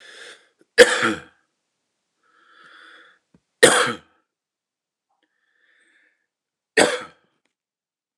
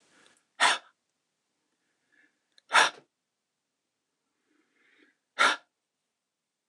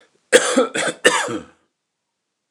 {"three_cough_length": "8.2 s", "three_cough_amplitude": 29204, "three_cough_signal_mean_std_ratio": 0.23, "exhalation_length": "6.7 s", "exhalation_amplitude": 16391, "exhalation_signal_mean_std_ratio": 0.21, "cough_length": "2.5 s", "cough_amplitude": 29204, "cough_signal_mean_std_ratio": 0.42, "survey_phase": "alpha (2021-03-01 to 2021-08-12)", "age": "45-64", "gender": "Male", "wearing_mask": "No", "symptom_none": true, "smoker_status": "Ex-smoker", "respiratory_condition_asthma": false, "respiratory_condition_other": false, "recruitment_source": "REACT", "submission_delay": "2 days", "covid_test_result": "Negative", "covid_test_method": "RT-qPCR"}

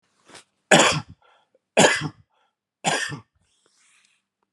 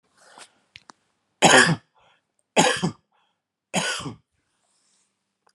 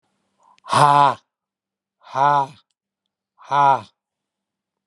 {"cough_length": "4.5 s", "cough_amplitude": 32094, "cough_signal_mean_std_ratio": 0.31, "three_cough_length": "5.5 s", "three_cough_amplitude": 30869, "three_cough_signal_mean_std_ratio": 0.3, "exhalation_length": "4.9 s", "exhalation_amplitude": 30136, "exhalation_signal_mean_std_ratio": 0.35, "survey_phase": "alpha (2021-03-01 to 2021-08-12)", "age": "65+", "gender": "Male", "wearing_mask": "No", "symptom_none": true, "smoker_status": "Never smoked", "respiratory_condition_asthma": false, "respiratory_condition_other": false, "recruitment_source": "REACT", "submission_delay": "1 day", "covid_test_result": "Negative", "covid_test_method": "RT-qPCR"}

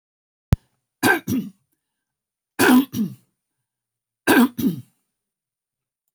{"three_cough_length": "6.1 s", "three_cough_amplitude": 24305, "three_cough_signal_mean_std_ratio": 0.34, "survey_phase": "alpha (2021-03-01 to 2021-08-12)", "age": "65+", "gender": "Female", "wearing_mask": "No", "symptom_none": true, "smoker_status": "Ex-smoker", "respiratory_condition_asthma": false, "respiratory_condition_other": false, "recruitment_source": "REACT", "submission_delay": "2 days", "covid_test_result": "Negative", "covid_test_method": "RT-qPCR"}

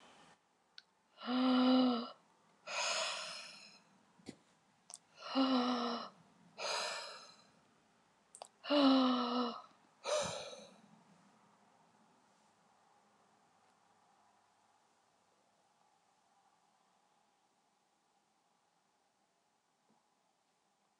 {"exhalation_length": "21.0 s", "exhalation_amplitude": 3688, "exhalation_signal_mean_std_ratio": 0.36, "survey_phase": "alpha (2021-03-01 to 2021-08-12)", "age": "65+", "gender": "Female", "wearing_mask": "No", "symptom_none": true, "smoker_status": "Never smoked", "respiratory_condition_asthma": true, "respiratory_condition_other": false, "recruitment_source": "REACT", "submission_delay": "2 days", "covid_test_result": "Negative", "covid_test_method": "RT-qPCR"}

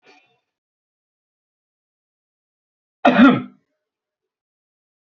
{"cough_length": "5.1 s", "cough_amplitude": 27379, "cough_signal_mean_std_ratio": 0.2, "survey_phase": "beta (2021-08-13 to 2022-03-07)", "age": "18-44", "gender": "Male", "wearing_mask": "No", "symptom_none": true, "symptom_onset": "12 days", "smoker_status": "Never smoked", "respiratory_condition_asthma": true, "respiratory_condition_other": false, "recruitment_source": "REACT", "submission_delay": "1 day", "covid_test_result": "Negative", "covid_test_method": "RT-qPCR"}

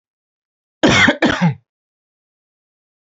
{"cough_length": "3.1 s", "cough_amplitude": 28715, "cough_signal_mean_std_ratio": 0.36, "survey_phase": "beta (2021-08-13 to 2022-03-07)", "age": "18-44", "gender": "Male", "wearing_mask": "No", "symptom_none": true, "smoker_status": "Never smoked", "respiratory_condition_asthma": false, "respiratory_condition_other": false, "recruitment_source": "REACT", "submission_delay": "2 days", "covid_test_result": "Negative", "covid_test_method": "RT-qPCR", "influenza_a_test_result": "Unknown/Void", "influenza_b_test_result": "Unknown/Void"}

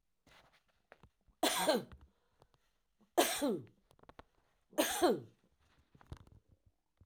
{"three_cough_length": "7.1 s", "three_cough_amplitude": 5730, "three_cough_signal_mean_std_ratio": 0.33, "survey_phase": "alpha (2021-03-01 to 2021-08-12)", "age": "65+", "gender": "Female", "wearing_mask": "No", "symptom_none": true, "smoker_status": "Ex-smoker", "respiratory_condition_asthma": false, "respiratory_condition_other": false, "recruitment_source": "REACT", "submission_delay": "2 days", "covid_test_result": "Negative", "covid_test_method": "RT-qPCR"}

